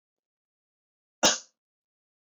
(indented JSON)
{
  "cough_length": "2.3 s",
  "cough_amplitude": 17089,
  "cough_signal_mean_std_ratio": 0.18,
  "survey_phase": "beta (2021-08-13 to 2022-03-07)",
  "age": "18-44",
  "gender": "Male",
  "wearing_mask": "No",
  "symptom_cough_any": true,
  "symptom_headache": true,
  "smoker_status": "Never smoked",
  "respiratory_condition_asthma": false,
  "respiratory_condition_other": false,
  "recruitment_source": "Test and Trace",
  "submission_delay": "1 day",
  "covid_test_result": "Positive",
  "covid_test_method": "RT-qPCR",
  "covid_ct_value": 20.3,
  "covid_ct_gene": "ORF1ab gene",
  "covid_ct_mean": 20.8,
  "covid_viral_load": "150000 copies/ml",
  "covid_viral_load_category": "Low viral load (10K-1M copies/ml)"
}